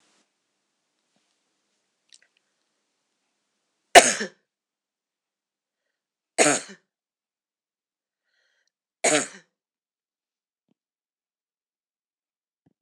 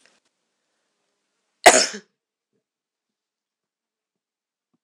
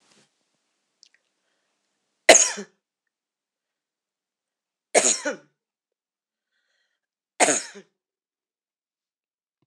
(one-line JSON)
{"three_cough_length": "12.8 s", "three_cough_amplitude": 26028, "three_cough_signal_mean_std_ratio": 0.14, "cough_length": "4.8 s", "cough_amplitude": 26028, "cough_signal_mean_std_ratio": 0.15, "exhalation_length": "9.7 s", "exhalation_amplitude": 26028, "exhalation_signal_mean_std_ratio": 0.19, "survey_phase": "alpha (2021-03-01 to 2021-08-12)", "age": "65+", "gender": "Female", "wearing_mask": "No", "symptom_none": true, "smoker_status": "Ex-smoker", "respiratory_condition_asthma": false, "respiratory_condition_other": false, "recruitment_source": "REACT", "submission_delay": "3 days", "covid_test_result": "Negative", "covid_test_method": "RT-qPCR"}